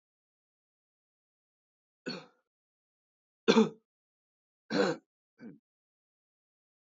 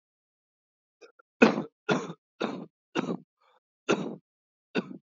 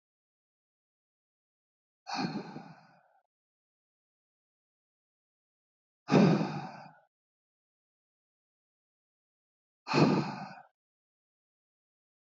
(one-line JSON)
{"three_cough_length": "6.9 s", "three_cough_amplitude": 13525, "three_cough_signal_mean_std_ratio": 0.2, "cough_length": "5.1 s", "cough_amplitude": 26102, "cough_signal_mean_std_ratio": 0.29, "exhalation_length": "12.2 s", "exhalation_amplitude": 9783, "exhalation_signal_mean_std_ratio": 0.24, "survey_phase": "beta (2021-08-13 to 2022-03-07)", "age": "18-44", "gender": "Male", "wearing_mask": "No", "symptom_cough_any": true, "symptom_runny_or_blocked_nose": true, "symptom_sore_throat": true, "smoker_status": "Never smoked", "respiratory_condition_asthma": false, "respiratory_condition_other": false, "recruitment_source": "Test and Trace", "submission_delay": "2 days", "covid_test_result": "Positive", "covid_test_method": "RT-qPCR", "covid_ct_value": 15.2, "covid_ct_gene": "ORF1ab gene"}